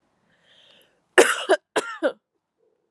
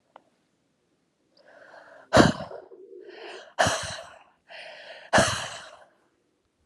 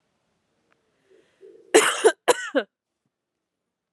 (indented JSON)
{
  "three_cough_length": "2.9 s",
  "three_cough_amplitude": 30813,
  "three_cough_signal_mean_std_ratio": 0.29,
  "exhalation_length": "6.7 s",
  "exhalation_amplitude": 24720,
  "exhalation_signal_mean_std_ratio": 0.3,
  "cough_length": "3.9 s",
  "cough_amplitude": 30254,
  "cough_signal_mean_std_ratio": 0.27,
  "survey_phase": "beta (2021-08-13 to 2022-03-07)",
  "age": "18-44",
  "gender": "Female",
  "wearing_mask": "No",
  "symptom_runny_or_blocked_nose": true,
  "symptom_shortness_of_breath": true,
  "symptom_fatigue": true,
  "symptom_fever_high_temperature": true,
  "symptom_headache": true,
  "symptom_change_to_sense_of_smell_or_taste": true,
  "symptom_loss_of_taste": true,
  "symptom_onset": "3 days",
  "smoker_status": "Never smoked",
  "respiratory_condition_asthma": false,
  "respiratory_condition_other": false,
  "recruitment_source": "Test and Trace",
  "submission_delay": "1 day",
  "covid_test_result": "Positive",
  "covid_test_method": "RT-qPCR",
  "covid_ct_value": 19.1,
  "covid_ct_gene": "ORF1ab gene",
  "covid_ct_mean": 19.7,
  "covid_viral_load": "360000 copies/ml",
  "covid_viral_load_category": "Low viral load (10K-1M copies/ml)"
}